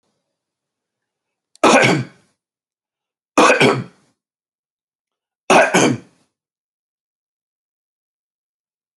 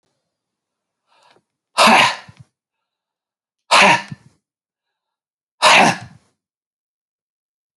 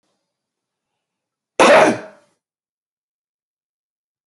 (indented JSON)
{
  "three_cough_length": "9.0 s",
  "three_cough_amplitude": 29984,
  "three_cough_signal_mean_std_ratio": 0.3,
  "exhalation_length": "7.8 s",
  "exhalation_amplitude": 31179,
  "exhalation_signal_mean_std_ratio": 0.29,
  "cough_length": "4.3 s",
  "cough_amplitude": 30616,
  "cough_signal_mean_std_ratio": 0.24,
  "survey_phase": "beta (2021-08-13 to 2022-03-07)",
  "age": "65+",
  "gender": "Male",
  "wearing_mask": "No",
  "symptom_cough_any": true,
  "symptom_runny_or_blocked_nose": true,
  "symptom_fatigue": true,
  "smoker_status": "Never smoked",
  "respiratory_condition_asthma": false,
  "respiratory_condition_other": false,
  "recruitment_source": "REACT",
  "submission_delay": "4 days",
  "covid_test_result": "Negative",
  "covid_test_method": "RT-qPCR",
  "influenza_a_test_result": "Negative",
  "influenza_b_test_result": "Negative"
}